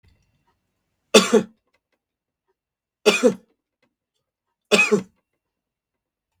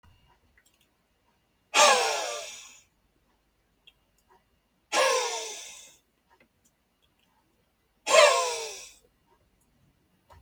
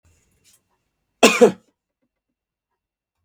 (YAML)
three_cough_length: 6.4 s
three_cough_amplitude: 32768
three_cough_signal_mean_std_ratio: 0.25
exhalation_length: 10.4 s
exhalation_amplitude: 19328
exhalation_signal_mean_std_ratio: 0.31
cough_length: 3.2 s
cough_amplitude: 32768
cough_signal_mean_std_ratio: 0.2
survey_phase: beta (2021-08-13 to 2022-03-07)
age: 45-64
gender: Male
wearing_mask: 'No'
symptom_none: true
smoker_status: Never smoked
respiratory_condition_asthma: false
respiratory_condition_other: false
recruitment_source: REACT
submission_delay: 13 days
covid_test_result: Negative
covid_test_method: RT-qPCR